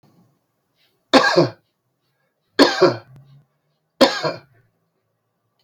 {
  "three_cough_length": "5.6 s",
  "three_cough_amplitude": 30572,
  "three_cough_signal_mean_std_ratio": 0.3,
  "survey_phase": "beta (2021-08-13 to 2022-03-07)",
  "age": "65+",
  "gender": "Male",
  "wearing_mask": "No",
  "symptom_none": true,
  "smoker_status": "Ex-smoker",
  "respiratory_condition_asthma": false,
  "respiratory_condition_other": false,
  "recruitment_source": "REACT",
  "submission_delay": "1 day",
  "covid_test_result": "Negative",
  "covid_test_method": "RT-qPCR"
}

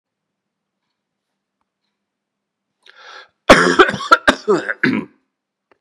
{
  "cough_length": "5.8 s",
  "cough_amplitude": 32768,
  "cough_signal_mean_std_ratio": 0.29,
  "survey_phase": "beta (2021-08-13 to 2022-03-07)",
  "age": "65+",
  "gender": "Male",
  "wearing_mask": "No",
  "symptom_cough_any": true,
  "symptom_runny_or_blocked_nose": true,
  "symptom_fatigue": true,
  "symptom_fever_high_temperature": true,
  "symptom_headache": true,
  "symptom_onset": "3 days",
  "smoker_status": "Never smoked",
  "respiratory_condition_asthma": false,
  "respiratory_condition_other": false,
  "recruitment_source": "Test and Trace",
  "submission_delay": "1 day",
  "covid_test_result": "Positive",
  "covid_test_method": "RT-qPCR",
  "covid_ct_value": 29.4,
  "covid_ct_gene": "N gene"
}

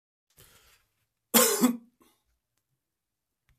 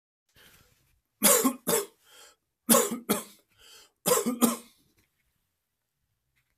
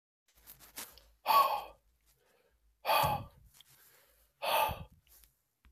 {
  "cough_length": "3.6 s",
  "cough_amplitude": 20622,
  "cough_signal_mean_std_ratio": 0.26,
  "three_cough_length": "6.6 s",
  "three_cough_amplitude": 20016,
  "three_cough_signal_mean_std_ratio": 0.34,
  "exhalation_length": "5.7 s",
  "exhalation_amplitude": 6565,
  "exhalation_signal_mean_std_ratio": 0.36,
  "survey_phase": "beta (2021-08-13 to 2022-03-07)",
  "age": "18-44",
  "gender": "Male",
  "wearing_mask": "No",
  "symptom_cough_any": true,
  "symptom_runny_or_blocked_nose": true,
  "symptom_change_to_sense_of_smell_or_taste": true,
  "smoker_status": "Ex-smoker",
  "respiratory_condition_asthma": false,
  "respiratory_condition_other": false,
  "recruitment_source": "Test and Trace",
  "submission_delay": "2 days",
  "covid_test_result": "Positive",
  "covid_test_method": "LFT"
}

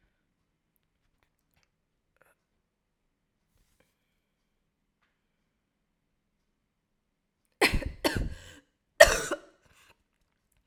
{
  "three_cough_length": "10.7 s",
  "three_cough_amplitude": 32768,
  "three_cough_signal_mean_std_ratio": 0.16,
  "survey_phase": "alpha (2021-03-01 to 2021-08-12)",
  "age": "18-44",
  "gender": "Female",
  "wearing_mask": "No",
  "symptom_cough_any": true,
  "symptom_shortness_of_breath": true,
  "symptom_fatigue": true,
  "symptom_headache": true,
  "symptom_onset": "3 days",
  "smoker_status": "Ex-smoker",
  "respiratory_condition_asthma": false,
  "respiratory_condition_other": false,
  "recruitment_source": "Test and Trace",
  "submission_delay": "2 days",
  "covid_test_result": "Positive",
  "covid_test_method": "RT-qPCR",
  "covid_ct_value": 30.6,
  "covid_ct_gene": "S gene",
  "covid_ct_mean": 31.8,
  "covid_viral_load": "37 copies/ml",
  "covid_viral_load_category": "Minimal viral load (< 10K copies/ml)"
}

